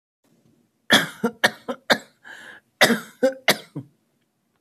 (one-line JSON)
{"cough_length": "4.6 s", "cough_amplitude": 26636, "cough_signal_mean_std_ratio": 0.32, "survey_phase": "alpha (2021-03-01 to 2021-08-12)", "age": "45-64", "gender": "Male", "wearing_mask": "No", "symptom_none": true, "smoker_status": "Ex-smoker", "respiratory_condition_asthma": false, "respiratory_condition_other": false, "recruitment_source": "REACT", "submission_delay": "1 day", "covid_test_result": "Negative", "covid_test_method": "RT-qPCR"}